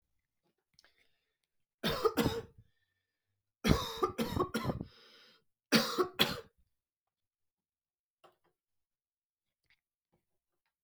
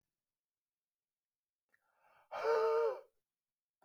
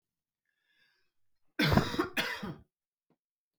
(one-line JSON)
{"three_cough_length": "10.8 s", "three_cough_amplitude": 9843, "three_cough_signal_mean_std_ratio": 0.3, "exhalation_length": "3.8 s", "exhalation_amplitude": 2322, "exhalation_signal_mean_std_ratio": 0.34, "cough_length": "3.6 s", "cough_amplitude": 10024, "cough_signal_mean_std_ratio": 0.34, "survey_phase": "alpha (2021-03-01 to 2021-08-12)", "age": "18-44", "gender": "Male", "wearing_mask": "No", "symptom_none": true, "smoker_status": "Current smoker (1 to 10 cigarettes per day)", "respiratory_condition_asthma": false, "respiratory_condition_other": false, "recruitment_source": "REACT", "submission_delay": "2 days", "covid_test_result": "Negative", "covid_test_method": "RT-qPCR"}